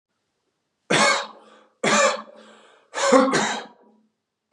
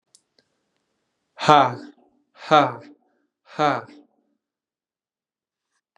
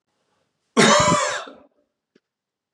{"three_cough_length": "4.5 s", "three_cough_amplitude": 29947, "three_cough_signal_mean_std_ratio": 0.45, "exhalation_length": "6.0 s", "exhalation_amplitude": 32751, "exhalation_signal_mean_std_ratio": 0.24, "cough_length": "2.7 s", "cough_amplitude": 30478, "cough_signal_mean_std_ratio": 0.39, "survey_phase": "beta (2021-08-13 to 2022-03-07)", "age": "18-44", "gender": "Male", "wearing_mask": "No", "symptom_runny_or_blocked_nose": true, "symptom_sore_throat": true, "symptom_fatigue": true, "symptom_fever_high_temperature": true, "symptom_headache": true, "symptom_onset": "4 days", "smoker_status": "Never smoked", "respiratory_condition_asthma": false, "respiratory_condition_other": false, "recruitment_source": "Test and Trace", "submission_delay": "2 days", "covid_test_result": "Positive", "covid_test_method": "RT-qPCR", "covid_ct_value": 25.5, "covid_ct_gene": "N gene"}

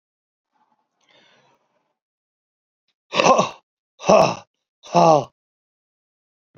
{"exhalation_length": "6.6 s", "exhalation_amplitude": 32768, "exhalation_signal_mean_std_ratio": 0.27, "survey_phase": "alpha (2021-03-01 to 2021-08-12)", "age": "45-64", "gender": "Male", "wearing_mask": "No", "symptom_abdominal_pain": true, "symptom_fatigue": true, "smoker_status": "Never smoked", "respiratory_condition_asthma": false, "respiratory_condition_other": true, "recruitment_source": "Test and Trace", "submission_delay": "2 days", "covid_test_result": "Positive", "covid_test_method": "RT-qPCR", "covid_ct_value": 31.6, "covid_ct_gene": "N gene", "covid_ct_mean": 32.4, "covid_viral_load": "24 copies/ml", "covid_viral_load_category": "Minimal viral load (< 10K copies/ml)"}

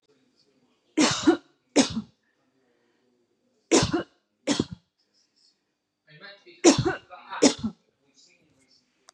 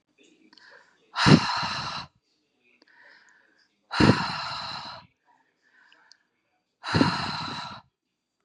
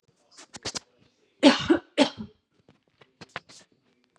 {"three_cough_length": "9.1 s", "three_cough_amplitude": 24602, "three_cough_signal_mean_std_ratio": 0.3, "exhalation_length": "8.4 s", "exhalation_amplitude": 25600, "exhalation_signal_mean_std_ratio": 0.34, "cough_length": "4.2 s", "cough_amplitude": 26172, "cough_signal_mean_std_ratio": 0.25, "survey_phase": "beta (2021-08-13 to 2022-03-07)", "age": "18-44", "gender": "Female", "wearing_mask": "No", "symptom_fatigue": true, "symptom_headache": true, "symptom_onset": "12 days", "smoker_status": "Never smoked", "respiratory_condition_asthma": false, "respiratory_condition_other": false, "recruitment_source": "REACT", "submission_delay": "9 days", "covid_test_result": "Negative", "covid_test_method": "RT-qPCR", "influenza_a_test_result": "Negative", "influenza_b_test_result": "Negative"}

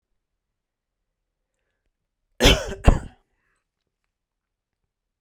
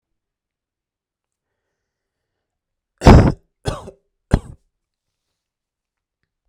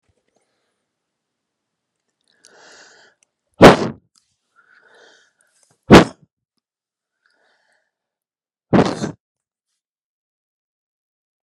{"cough_length": "5.2 s", "cough_amplitude": 29318, "cough_signal_mean_std_ratio": 0.19, "three_cough_length": "6.5 s", "three_cough_amplitude": 32768, "three_cough_signal_mean_std_ratio": 0.18, "exhalation_length": "11.4 s", "exhalation_amplitude": 32768, "exhalation_signal_mean_std_ratio": 0.17, "survey_phase": "beta (2021-08-13 to 2022-03-07)", "age": "18-44", "gender": "Male", "wearing_mask": "No", "symptom_none": true, "symptom_onset": "12 days", "smoker_status": "Never smoked", "respiratory_condition_asthma": false, "respiratory_condition_other": false, "recruitment_source": "REACT", "submission_delay": "3 days", "covid_test_result": "Negative", "covid_test_method": "RT-qPCR"}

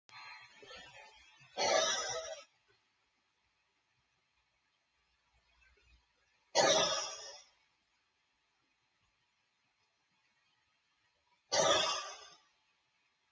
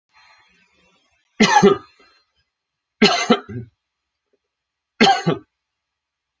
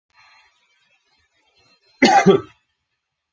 {"exhalation_length": "13.3 s", "exhalation_amplitude": 5086, "exhalation_signal_mean_std_ratio": 0.31, "three_cough_length": "6.4 s", "three_cough_amplitude": 30569, "three_cough_signal_mean_std_ratio": 0.31, "cough_length": "3.3 s", "cough_amplitude": 28267, "cough_signal_mean_std_ratio": 0.27, "survey_phase": "alpha (2021-03-01 to 2021-08-12)", "age": "45-64", "gender": "Male", "wearing_mask": "No", "symptom_none": true, "smoker_status": "Current smoker (1 to 10 cigarettes per day)", "respiratory_condition_asthma": false, "respiratory_condition_other": false, "recruitment_source": "REACT", "submission_delay": "1 day", "covid_test_result": "Negative", "covid_test_method": "RT-qPCR"}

